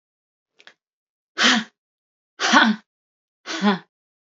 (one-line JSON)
{"exhalation_length": "4.4 s", "exhalation_amplitude": 27917, "exhalation_signal_mean_std_ratio": 0.34, "survey_phase": "alpha (2021-03-01 to 2021-08-12)", "age": "45-64", "gender": "Female", "wearing_mask": "No", "symptom_none": true, "smoker_status": "Ex-smoker", "respiratory_condition_asthma": false, "respiratory_condition_other": false, "recruitment_source": "REACT", "submission_delay": "4 days", "covid_test_result": "Negative", "covid_test_method": "RT-qPCR"}